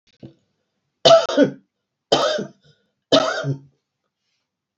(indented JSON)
{
  "three_cough_length": "4.8 s",
  "three_cough_amplitude": 32235,
  "three_cough_signal_mean_std_ratio": 0.35,
  "survey_phase": "beta (2021-08-13 to 2022-03-07)",
  "age": "65+",
  "gender": "Female",
  "wearing_mask": "No",
  "symptom_none": true,
  "smoker_status": "Ex-smoker",
  "respiratory_condition_asthma": false,
  "respiratory_condition_other": false,
  "recruitment_source": "REACT",
  "submission_delay": "2 days",
  "covid_test_result": "Negative",
  "covid_test_method": "RT-qPCR",
  "influenza_a_test_result": "Negative",
  "influenza_b_test_result": "Negative"
}